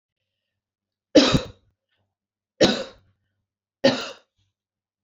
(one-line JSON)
{"three_cough_length": "5.0 s", "three_cough_amplitude": 26972, "three_cough_signal_mean_std_ratio": 0.26, "survey_phase": "beta (2021-08-13 to 2022-03-07)", "age": "45-64", "gender": "Female", "wearing_mask": "No", "symptom_none": true, "smoker_status": "Ex-smoker", "respiratory_condition_asthma": false, "respiratory_condition_other": false, "recruitment_source": "REACT", "submission_delay": "2 days", "covid_test_result": "Negative", "covid_test_method": "RT-qPCR"}